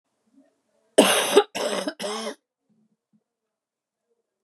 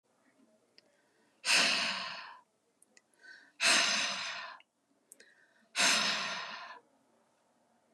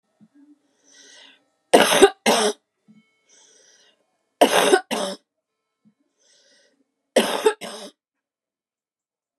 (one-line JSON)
{"cough_length": "4.4 s", "cough_amplitude": 30212, "cough_signal_mean_std_ratio": 0.32, "exhalation_length": "7.9 s", "exhalation_amplitude": 6979, "exhalation_signal_mean_std_ratio": 0.43, "three_cough_length": "9.4 s", "three_cough_amplitude": 32767, "three_cough_signal_mean_std_ratio": 0.3, "survey_phase": "beta (2021-08-13 to 2022-03-07)", "age": "45-64", "gender": "Female", "wearing_mask": "No", "symptom_cough_any": true, "symptom_runny_or_blocked_nose": true, "symptom_onset": "8 days", "smoker_status": "Never smoked", "respiratory_condition_asthma": false, "respiratory_condition_other": false, "recruitment_source": "REACT", "submission_delay": "1 day", "covid_test_result": "Negative", "covid_test_method": "RT-qPCR"}